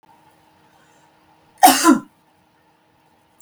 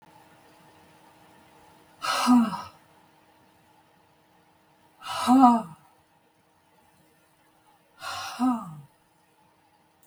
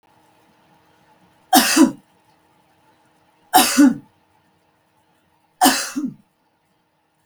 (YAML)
cough_length: 3.4 s
cough_amplitude: 32768
cough_signal_mean_std_ratio: 0.25
exhalation_length: 10.1 s
exhalation_amplitude: 19156
exhalation_signal_mean_std_ratio: 0.3
three_cough_length: 7.3 s
three_cough_amplitude: 32768
three_cough_signal_mean_std_ratio: 0.3
survey_phase: beta (2021-08-13 to 2022-03-07)
age: 65+
gender: Female
wearing_mask: 'No'
symptom_none: true
smoker_status: Never smoked
respiratory_condition_asthma: false
respiratory_condition_other: false
recruitment_source: REACT
submission_delay: 1 day
covid_test_result: Negative
covid_test_method: RT-qPCR
influenza_a_test_result: Negative
influenza_b_test_result: Negative